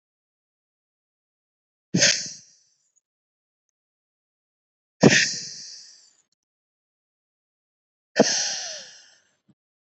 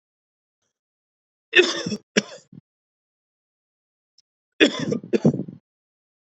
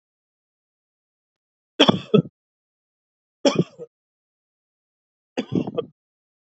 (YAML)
exhalation_length: 10.0 s
exhalation_amplitude: 28474
exhalation_signal_mean_std_ratio: 0.24
cough_length: 6.3 s
cough_amplitude: 27810
cough_signal_mean_std_ratio: 0.27
three_cough_length: 6.5 s
three_cough_amplitude: 28170
three_cough_signal_mean_std_ratio: 0.22
survey_phase: beta (2021-08-13 to 2022-03-07)
age: 18-44
gender: Male
wearing_mask: 'No'
symptom_cough_any: true
symptom_runny_or_blocked_nose: true
symptom_fatigue: true
symptom_fever_high_temperature: true
symptom_headache: true
symptom_onset: 3 days
smoker_status: Never smoked
respiratory_condition_asthma: false
respiratory_condition_other: false
recruitment_source: Test and Trace
submission_delay: 1 day
covid_test_result: Positive
covid_test_method: RT-qPCR